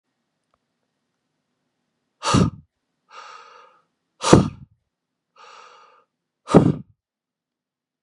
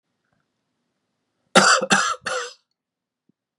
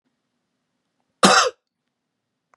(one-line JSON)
{"exhalation_length": "8.0 s", "exhalation_amplitude": 32768, "exhalation_signal_mean_std_ratio": 0.22, "three_cough_length": "3.6 s", "three_cough_amplitude": 32613, "three_cough_signal_mean_std_ratio": 0.32, "cough_length": "2.6 s", "cough_amplitude": 32767, "cough_signal_mean_std_ratio": 0.25, "survey_phase": "beta (2021-08-13 to 2022-03-07)", "age": "18-44", "gender": "Male", "wearing_mask": "No", "symptom_headache": true, "symptom_onset": "13 days", "smoker_status": "Never smoked", "respiratory_condition_asthma": false, "respiratory_condition_other": false, "recruitment_source": "REACT", "submission_delay": "2 days", "covid_test_result": "Negative", "covid_test_method": "RT-qPCR", "influenza_a_test_result": "Negative", "influenza_b_test_result": "Negative"}